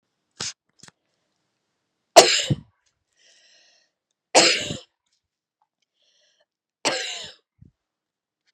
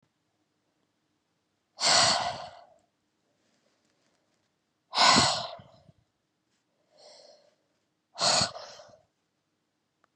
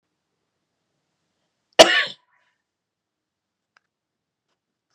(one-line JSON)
{"three_cough_length": "8.5 s", "three_cough_amplitude": 32768, "three_cough_signal_mean_std_ratio": 0.22, "exhalation_length": "10.2 s", "exhalation_amplitude": 13729, "exhalation_signal_mean_std_ratio": 0.3, "cough_length": "4.9 s", "cough_amplitude": 32768, "cough_signal_mean_std_ratio": 0.15, "survey_phase": "beta (2021-08-13 to 2022-03-07)", "age": "18-44", "gender": "Female", "wearing_mask": "No", "symptom_cough_any": true, "symptom_fatigue": true, "symptom_onset": "4 days", "smoker_status": "Never smoked", "respiratory_condition_asthma": false, "respiratory_condition_other": false, "recruitment_source": "Test and Trace", "submission_delay": "2 days", "covid_test_result": "Positive", "covid_test_method": "RT-qPCR", "covid_ct_value": 24.8, "covid_ct_gene": "N gene"}